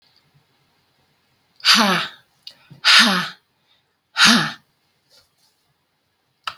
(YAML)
exhalation_length: 6.6 s
exhalation_amplitude: 32768
exhalation_signal_mean_std_ratio: 0.33
survey_phase: alpha (2021-03-01 to 2021-08-12)
age: 45-64
gender: Female
wearing_mask: 'No'
symptom_none: true
smoker_status: Prefer not to say
respiratory_condition_asthma: false
respiratory_condition_other: false
recruitment_source: REACT
submission_delay: 1 day
covid_test_result: Negative
covid_test_method: RT-qPCR